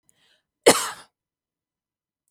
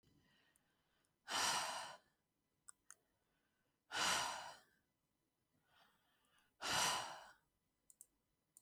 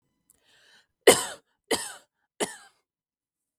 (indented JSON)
{
  "cough_length": "2.3 s",
  "cough_amplitude": 32768,
  "cough_signal_mean_std_ratio": 0.19,
  "exhalation_length": "8.6 s",
  "exhalation_amplitude": 1648,
  "exhalation_signal_mean_std_ratio": 0.36,
  "three_cough_length": "3.6 s",
  "three_cough_amplitude": 32766,
  "three_cough_signal_mean_std_ratio": 0.2,
  "survey_phase": "beta (2021-08-13 to 2022-03-07)",
  "age": "18-44",
  "gender": "Female",
  "wearing_mask": "No",
  "symptom_none": true,
  "symptom_onset": "4 days",
  "smoker_status": "Never smoked",
  "respiratory_condition_asthma": false,
  "respiratory_condition_other": false,
  "recruitment_source": "REACT",
  "submission_delay": "1 day",
  "covid_test_result": "Negative",
  "covid_test_method": "RT-qPCR"
}